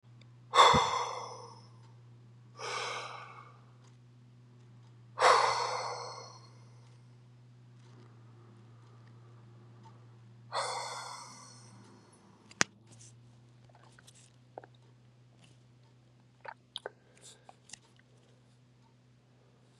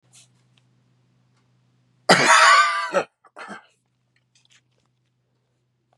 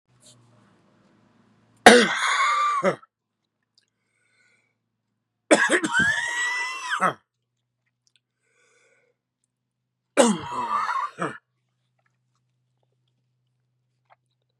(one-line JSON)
{"exhalation_length": "19.8 s", "exhalation_amplitude": 30383, "exhalation_signal_mean_std_ratio": 0.3, "cough_length": "6.0 s", "cough_amplitude": 32767, "cough_signal_mean_std_ratio": 0.3, "three_cough_length": "14.6 s", "three_cough_amplitude": 32768, "three_cough_signal_mean_std_ratio": 0.33, "survey_phase": "beta (2021-08-13 to 2022-03-07)", "age": "45-64", "gender": "Male", "wearing_mask": "No", "symptom_cough_any": true, "symptom_runny_or_blocked_nose": true, "symptom_shortness_of_breath": true, "symptom_sore_throat": true, "symptom_fatigue": true, "symptom_change_to_sense_of_smell_or_taste": true, "smoker_status": "Ex-smoker", "respiratory_condition_asthma": false, "respiratory_condition_other": true, "recruitment_source": "Test and Trace", "submission_delay": "1 day", "covid_test_result": "Positive", "covid_test_method": "LFT"}